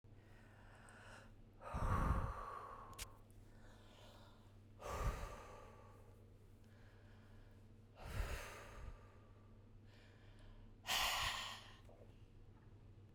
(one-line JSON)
{"exhalation_length": "13.1 s", "exhalation_amplitude": 1704, "exhalation_signal_mean_std_ratio": 0.54, "survey_phase": "beta (2021-08-13 to 2022-03-07)", "age": "45-64", "gender": "Female", "wearing_mask": "No", "symptom_none": true, "smoker_status": "Ex-smoker", "respiratory_condition_asthma": false, "respiratory_condition_other": false, "recruitment_source": "REACT", "submission_delay": "1 day", "covid_test_result": "Negative", "covid_test_method": "RT-qPCR"}